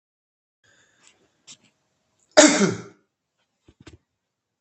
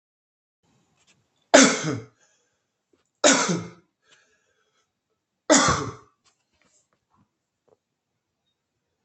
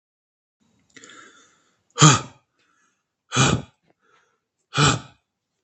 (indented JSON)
{
  "cough_length": "4.6 s",
  "cough_amplitude": 32768,
  "cough_signal_mean_std_ratio": 0.21,
  "three_cough_length": "9.0 s",
  "three_cough_amplitude": 32768,
  "three_cough_signal_mean_std_ratio": 0.25,
  "exhalation_length": "5.6 s",
  "exhalation_amplitude": 32768,
  "exhalation_signal_mean_std_ratio": 0.27,
  "survey_phase": "beta (2021-08-13 to 2022-03-07)",
  "age": "18-44",
  "gender": "Male",
  "wearing_mask": "No",
  "symptom_none": true,
  "smoker_status": "Current smoker (e-cigarettes or vapes only)",
  "respiratory_condition_asthma": false,
  "respiratory_condition_other": false,
  "recruitment_source": "REACT",
  "submission_delay": "1 day",
  "covid_test_result": "Negative",
  "covid_test_method": "RT-qPCR",
  "influenza_a_test_result": "Negative",
  "influenza_b_test_result": "Negative"
}